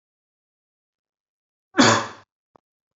cough_length: 3.0 s
cough_amplitude: 28600
cough_signal_mean_std_ratio: 0.23
survey_phase: beta (2021-08-13 to 2022-03-07)
age: 18-44
gender: Male
wearing_mask: 'No'
symptom_sore_throat: true
smoker_status: Never smoked
respiratory_condition_asthma: false
respiratory_condition_other: false
recruitment_source: REACT
submission_delay: 1 day
covid_test_result: Negative
covid_test_method: RT-qPCR
influenza_a_test_result: Negative
influenza_b_test_result: Negative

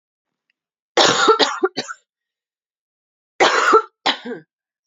cough_length: 4.9 s
cough_amplitude: 32767
cough_signal_mean_std_ratio: 0.4
survey_phase: beta (2021-08-13 to 2022-03-07)
age: 18-44
gender: Female
wearing_mask: 'No'
symptom_cough_any: true
symptom_runny_or_blocked_nose: true
symptom_sore_throat: true
symptom_fatigue: true
symptom_headache: true
symptom_onset: 4 days
smoker_status: Never smoked
respiratory_condition_asthma: false
respiratory_condition_other: false
recruitment_source: Test and Trace
submission_delay: 1 day
covid_test_result: Positive
covid_test_method: ePCR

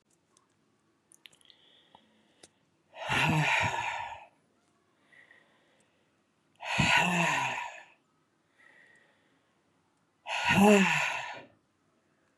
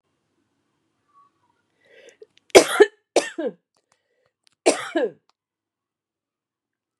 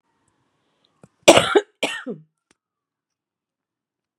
exhalation_length: 12.4 s
exhalation_amplitude: 11490
exhalation_signal_mean_std_ratio: 0.39
three_cough_length: 7.0 s
three_cough_amplitude: 32768
three_cough_signal_mean_std_ratio: 0.2
cough_length: 4.2 s
cough_amplitude: 32768
cough_signal_mean_std_ratio: 0.21
survey_phase: beta (2021-08-13 to 2022-03-07)
age: 65+
gender: Female
wearing_mask: 'No'
symptom_cough_any: true
symptom_fever_high_temperature: true
symptom_headache: true
symptom_change_to_sense_of_smell_or_taste: true
smoker_status: Ex-smoker
respiratory_condition_asthma: false
respiratory_condition_other: false
recruitment_source: Test and Trace
submission_delay: 1 day
covid_test_result: Positive
covid_test_method: RT-qPCR
covid_ct_value: 29.2
covid_ct_gene: N gene
covid_ct_mean: 29.5
covid_viral_load: 210 copies/ml
covid_viral_load_category: Minimal viral load (< 10K copies/ml)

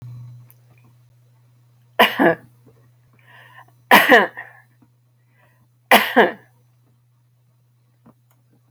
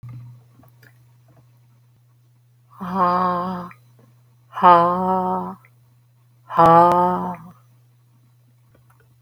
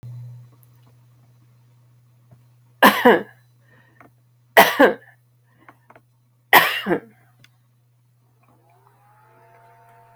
cough_length: 8.7 s
cough_amplitude: 32235
cough_signal_mean_std_ratio: 0.27
exhalation_length: 9.2 s
exhalation_amplitude: 27483
exhalation_signal_mean_std_ratio: 0.4
three_cough_length: 10.2 s
three_cough_amplitude: 32326
three_cough_signal_mean_std_ratio: 0.25
survey_phase: alpha (2021-03-01 to 2021-08-12)
age: 65+
gender: Female
wearing_mask: 'No'
symptom_none: true
smoker_status: Ex-smoker
respiratory_condition_asthma: false
respiratory_condition_other: false
recruitment_source: REACT
submission_delay: 1 day
covid_test_result: Negative
covid_test_method: RT-qPCR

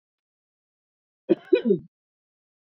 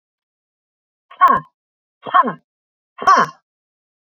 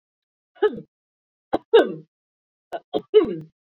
cough_length: 2.7 s
cough_amplitude: 15771
cough_signal_mean_std_ratio: 0.24
exhalation_length: 4.0 s
exhalation_amplitude: 29662
exhalation_signal_mean_std_ratio: 0.3
three_cough_length: 3.8 s
three_cough_amplitude: 21175
three_cough_signal_mean_std_ratio: 0.3
survey_phase: beta (2021-08-13 to 2022-03-07)
age: 45-64
gender: Female
wearing_mask: 'No'
symptom_none: true
smoker_status: Never smoked
respiratory_condition_asthma: true
respiratory_condition_other: false
recruitment_source: REACT
submission_delay: 2 days
covid_test_result: Negative
covid_test_method: RT-qPCR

